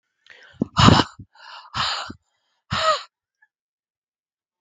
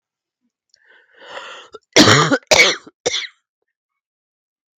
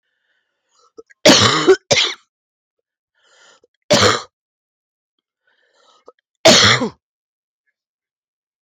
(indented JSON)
{
  "exhalation_length": "4.6 s",
  "exhalation_amplitude": 32768,
  "exhalation_signal_mean_std_ratio": 0.31,
  "cough_length": "4.8 s",
  "cough_amplitude": 32768,
  "cough_signal_mean_std_ratio": 0.33,
  "three_cough_length": "8.6 s",
  "three_cough_amplitude": 32768,
  "three_cough_signal_mean_std_ratio": 0.32,
  "survey_phase": "beta (2021-08-13 to 2022-03-07)",
  "age": "45-64",
  "gender": "Female",
  "wearing_mask": "No",
  "symptom_cough_any": true,
  "symptom_runny_or_blocked_nose": true,
  "symptom_sore_throat": true,
  "symptom_fatigue": true,
  "symptom_headache": true,
  "symptom_change_to_sense_of_smell_or_taste": true,
  "symptom_loss_of_taste": true,
  "symptom_other": true,
  "symptom_onset": "5 days",
  "smoker_status": "Ex-smoker",
  "respiratory_condition_asthma": false,
  "respiratory_condition_other": false,
  "recruitment_source": "Test and Trace",
  "submission_delay": "2 days",
  "covid_test_result": "Positive",
  "covid_test_method": "RT-qPCR",
  "covid_ct_value": 18.0,
  "covid_ct_gene": "N gene"
}